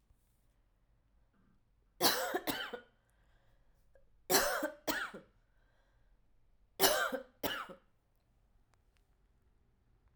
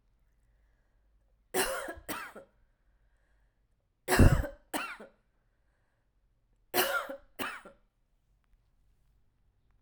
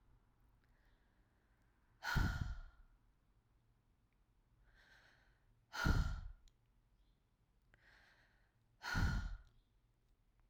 {"three_cough_length": "10.2 s", "three_cough_amplitude": 9974, "three_cough_signal_mean_std_ratio": 0.33, "cough_length": "9.8 s", "cough_amplitude": 14349, "cough_signal_mean_std_ratio": 0.26, "exhalation_length": "10.5 s", "exhalation_amplitude": 2440, "exhalation_signal_mean_std_ratio": 0.33, "survey_phase": "alpha (2021-03-01 to 2021-08-12)", "age": "18-44", "gender": "Female", "wearing_mask": "No", "symptom_cough_any": true, "symptom_fever_high_temperature": true, "smoker_status": "Ex-smoker", "respiratory_condition_asthma": false, "respiratory_condition_other": false, "recruitment_source": "Test and Trace", "submission_delay": "1 day", "covid_test_result": "Positive", "covid_test_method": "RT-qPCR", "covid_ct_value": 33.3, "covid_ct_gene": "N gene"}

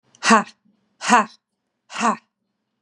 {"exhalation_length": "2.8 s", "exhalation_amplitude": 32322, "exhalation_signal_mean_std_ratio": 0.33, "survey_phase": "beta (2021-08-13 to 2022-03-07)", "age": "18-44", "gender": "Female", "wearing_mask": "No", "symptom_none": true, "smoker_status": "Ex-smoker", "respiratory_condition_asthma": false, "respiratory_condition_other": false, "recruitment_source": "REACT", "submission_delay": "1 day", "covid_test_result": "Negative", "covid_test_method": "RT-qPCR", "influenza_a_test_result": "Negative", "influenza_b_test_result": "Negative"}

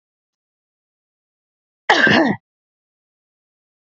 {"cough_length": "3.9 s", "cough_amplitude": 28889, "cough_signal_mean_std_ratio": 0.27, "survey_phase": "beta (2021-08-13 to 2022-03-07)", "age": "45-64", "gender": "Female", "wearing_mask": "No", "symptom_change_to_sense_of_smell_or_taste": true, "symptom_loss_of_taste": true, "smoker_status": "Never smoked", "respiratory_condition_asthma": false, "respiratory_condition_other": false, "recruitment_source": "Test and Trace", "submission_delay": "1 day", "covid_test_result": "Positive", "covid_test_method": "RT-qPCR", "covid_ct_value": 21.1, "covid_ct_gene": "ORF1ab gene", "covid_ct_mean": 21.3, "covid_viral_load": "100000 copies/ml", "covid_viral_load_category": "Low viral load (10K-1M copies/ml)"}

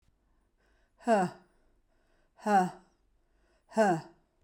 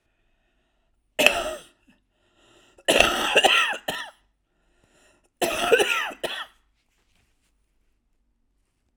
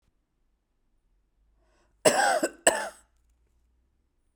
{"exhalation_length": "4.4 s", "exhalation_amplitude": 6515, "exhalation_signal_mean_std_ratio": 0.35, "three_cough_length": "9.0 s", "three_cough_amplitude": 32768, "three_cough_signal_mean_std_ratio": 0.36, "cough_length": "4.4 s", "cough_amplitude": 21133, "cough_signal_mean_std_ratio": 0.28, "survey_phase": "beta (2021-08-13 to 2022-03-07)", "age": "45-64", "gender": "Female", "wearing_mask": "No", "symptom_cough_any": true, "symptom_runny_or_blocked_nose": true, "symptom_fatigue": true, "symptom_onset": "5 days", "smoker_status": "Never smoked", "respiratory_condition_asthma": false, "respiratory_condition_other": false, "recruitment_source": "Test and Trace", "submission_delay": "2 days", "covid_test_result": "Positive", "covid_test_method": "ePCR"}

